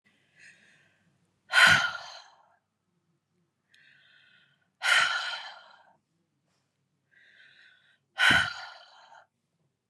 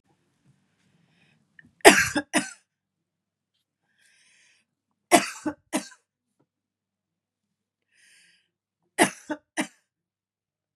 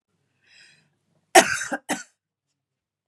{"exhalation_length": "9.9 s", "exhalation_amplitude": 15124, "exhalation_signal_mean_std_ratio": 0.28, "three_cough_length": "10.8 s", "three_cough_amplitude": 32767, "three_cough_signal_mean_std_ratio": 0.19, "cough_length": "3.1 s", "cough_amplitude": 32767, "cough_signal_mean_std_ratio": 0.21, "survey_phase": "beta (2021-08-13 to 2022-03-07)", "age": "45-64", "gender": "Female", "wearing_mask": "No", "symptom_cough_any": true, "symptom_onset": "2 days", "smoker_status": "Never smoked", "respiratory_condition_asthma": false, "respiratory_condition_other": false, "recruitment_source": "Test and Trace", "submission_delay": "1 day", "covid_test_result": "Negative", "covid_test_method": "RT-qPCR"}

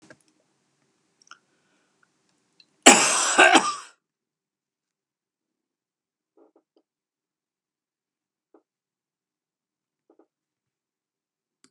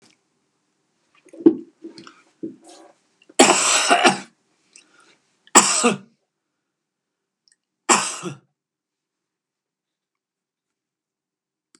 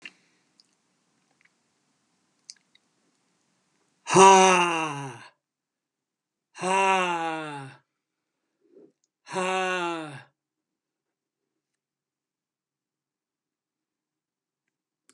{"cough_length": "11.7 s", "cough_amplitude": 32768, "cough_signal_mean_std_ratio": 0.18, "three_cough_length": "11.8 s", "three_cough_amplitude": 32768, "three_cough_signal_mean_std_ratio": 0.27, "exhalation_length": "15.1 s", "exhalation_amplitude": 25389, "exhalation_signal_mean_std_ratio": 0.27, "survey_phase": "beta (2021-08-13 to 2022-03-07)", "age": "65+", "gender": "Male", "wearing_mask": "No", "symptom_none": true, "smoker_status": "Never smoked", "respiratory_condition_asthma": false, "respiratory_condition_other": false, "recruitment_source": "REACT", "submission_delay": "2 days", "covid_test_result": "Negative", "covid_test_method": "RT-qPCR", "influenza_a_test_result": "Negative", "influenza_b_test_result": "Negative"}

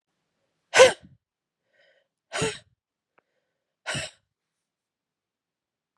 {"exhalation_length": "6.0 s", "exhalation_amplitude": 28987, "exhalation_signal_mean_std_ratio": 0.18, "survey_phase": "beta (2021-08-13 to 2022-03-07)", "age": "18-44", "gender": "Female", "wearing_mask": "No", "symptom_cough_any": true, "symptom_new_continuous_cough": true, "symptom_runny_or_blocked_nose": true, "symptom_sore_throat": true, "symptom_fatigue": true, "smoker_status": "Ex-smoker", "respiratory_condition_asthma": true, "respiratory_condition_other": false, "recruitment_source": "Test and Trace", "submission_delay": "0 days", "covid_test_result": "Positive", "covid_test_method": "LFT"}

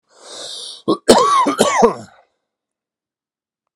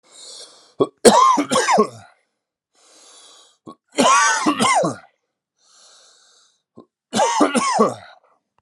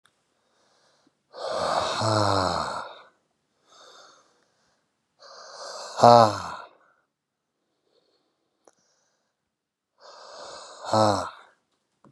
{"cough_length": "3.8 s", "cough_amplitude": 32768, "cough_signal_mean_std_ratio": 0.43, "three_cough_length": "8.6 s", "three_cough_amplitude": 32768, "three_cough_signal_mean_std_ratio": 0.45, "exhalation_length": "12.1 s", "exhalation_amplitude": 30919, "exhalation_signal_mean_std_ratio": 0.29, "survey_phase": "alpha (2021-03-01 to 2021-08-12)", "age": "45-64", "gender": "Male", "wearing_mask": "No", "symptom_cough_any": true, "symptom_fatigue": true, "symptom_headache": true, "smoker_status": "Ex-smoker", "respiratory_condition_asthma": false, "respiratory_condition_other": false, "recruitment_source": "Test and Trace", "submission_delay": "3 days", "covid_test_result": "Positive", "covid_test_method": "RT-qPCR"}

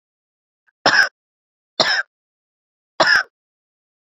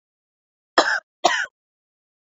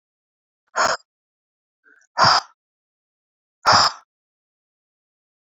{"three_cough_length": "4.2 s", "three_cough_amplitude": 32767, "three_cough_signal_mean_std_ratio": 0.31, "cough_length": "2.4 s", "cough_amplitude": 29077, "cough_signal_mean_std_ratio": 0.29, "exhalation_length": "5.5 s", "exhalation_amplitude": 26826, "exhalation_signal_mean_std_ratio": 0.27, "survey_phase": "beta (2021-08-13 to 2022-03-07)", "age": "18-44", "gender": "Female", "wearing_mask": "No", "symptom_runny_or_blocked_nose": true, "symptom_sore_throat": true, "symptom_fatigue": true, "symptom_headache": true, "symptom_other": true, "smoker_status": "Current smoker (e-cigarettes or vapes only)", "respiratory_condition_asthma": false, "respiratory_condition_other": false, "recruitment_source": "Test and Trace", "submission_delay": "3 days", "covid_test_result": "Positive", "covid_test_method": "RT-qPCR", "covid_ct_value": 23.0, "covid_ct_gene": "N gene", "covid_ct_mean": 23.1, "covid_viral_load": "26000 copies/ml", "covid_viral_load_category": "Low viral load (10K-1M copies/ml)"}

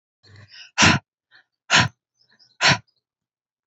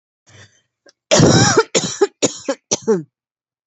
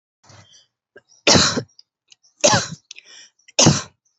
{"exhalation_length": "3.7 s", "exhalation_amplitude": 26666, "exhalation_signal_mean_std_ratio": 0.3, "cough_length": "3.7 s", "cough_amplitude": 29840, "cough_signal_mean_std_ratio": 0.44, "three_cough_length": "4.2 s", "three_cough_amplitude": 30305, "three_cough_signal_mean_std_ratio": 0.34, "survey_phase": "alpha (2021-03-01 to 2021-08-12)", "age": "18-44", "gender": "Female", "wearing_mask": "No", "symptom_shortness_of_breath": true, "symptom_headache": true, "symptom_change_to_sense_of_smell_or_taste": true, "symptom_loss_of_taste": true, "symptom_onset": "3 days", "smoker_status": "Never smoked", "respiratory_condition_asthma": false, "respiratory_condition_other": false, "recruitment_source": "Test and Trace", "submission_delay": "2 days", "covid_test_result": "Positive", "covid_test_method": "RT-qPCR", "covid_ct_value": 18.2, "covid_ct_gene": "ORF1ab gene", "covid_ct_mean": 19.0, "covid_viral_load": "610000 copies/ml", "covid_viral_load_category": "Low viral load (10K-1M copies/ml)"}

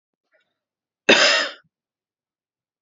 {"cough_length": "2.8 s", "cough_amplitude": 29247, "cough_signal_mean_std_ratio": 0.28, "survey_phase": "beta (2021-08-13 to 2022-03-07)", "age": "18-44", "gender": "Female", "wearing_mask": "No", "symptom_sore_throat": true, "symptom_fatigue": true, "symptom_headache": true, "symptom_onset": "2 days", "smoker_status": "Current smoker (e-cigarettes or vapes only)", "respiratory_condition_asthma": false, "respiratory_condition_other": false, "recruitment_source": "Test and Trace", "submission_delay": "2 days", "covid_test_result": "Negative", "covid_test_method": "RT-qPCR"}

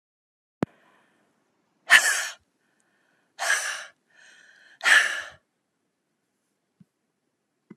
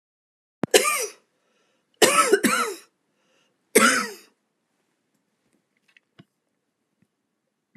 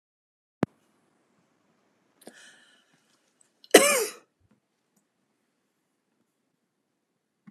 {"exhalation_length": "7.8 s", "exhalation_amplitude": 30493, "exhalation_signal_mean_std_ratio": 0.26, "three_cough_length": "7.8 s", "three_cough_amplitude": 31327, "three_cough_signal_mean_std_ratio": 0.3, "cough_length": "7.5 s", "cough_amplitude": 32767, "cough_signal_mean_std_ratio": 0.15, "survey_phase": "beta (2021-08-13 to 2022-03-07)", "age": "65+", "gender": "Female", "wearing_mask": "No", "symptom_none": true, "smoker_status": "Never smoked", "respiratory_condition_asthma": true, "respiratory_condition_other": false, "recruitment_source": "REACT", "submission_delay": "1 day", "covid_test_result": "Negative", "covid_test_method": "RT-qPCR"}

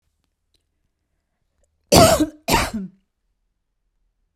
{"cough_length": "4.4 s", "cough_amplitude": 32768, "cough_signal_mean_std_ratio": 0.28, "survey_phase": "beta (2021-08-13 to 2022-03-07)", "age": "45-64", "gender": "Female", "wearing_mask": "No", "symptom_none": true, "smoker_status": "Ex-smoker", "respiratory_condition_asthma": false, "respiratory_condition_other": false, "recruitment_source": "REACT", "submission_delay": "0 days", "covid_test_result": "Negative", "covid_test_method": "RT-qPCR"}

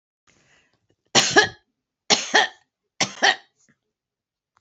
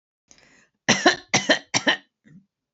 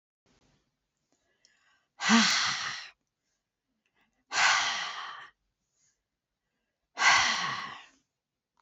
{"three_cough_length": "4.6 s", "three_cough_amplitude": 27932, "three_cough_signal_mean_std_ratio": 0.3, "cough_length": "2.7 s", "cough_amplitude": 27869, "cough_signal_mean_std_ratio": 0.35, "exhalation_length": "8.6 s", "exhalation_amplitude": 13880, "exhalation_signal_mean_std_ratio": 0.38, "survey_phase": "beta (2021-08-13 to 2022-03-07)", "age": "65+", "gender": "Female", "wearing_mask": "No", "symptom_none": true, "smoker_status": "Current smoker (e-cigarettes or vapes only)", "respiratory_condition_asthma": false, "respiratory_condition_other": false, "recruitment_source": "REACT", "submission_delay": "4 days", "covid_test_result": "Negative", "covid_test_method": "RT-qPCR", "influenza_a_test_result": "Negative", "influenza_b_test_result": "Negative"}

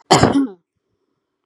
{"cough_length": "1.5 s", "cough_amplitude": 32768, "cough_signal_mean_std_ratio": 0.39, "survey_phase": "beta (2021-08-13 to 2022-03-07)", "age": "18-44", "gender": "Female", "wearing_mask": "No", "symptom_none": true, "smoker_status": "Never smoked", "respiratory_condition_asthma": false, "respiratory_condition_other": false, "recruitment_source": "Test and Trace", "submission_delay": "1 day", "covid_test_result": "Negative", "covid_test_method": "RT-qPCR"}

